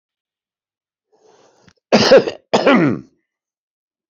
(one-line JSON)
{"cough_length": "4.1 s", "cough_amplitude": 29721, "cough_signal_mean_std_ratio": 0.34, "survey_phase": "beta (2021-08-13 to 2022-03-07)", "age": "65+", "gender": "Male", "wearing_mask": "No", "symptom_none": true, "symptom_onset": "10 days", "smoker_status": "Ex-smoker", "respiratory_condition_asthma": false, "respiratory_condition_other": true, "recruitment_source": "REACT", "submission_delay": "1 day", "covid_test_result": "Negative", "covid_test_method": "RT-qPCR", "influenza_a_test_result": "Negative", "influenza_b_test_result": "Negative"}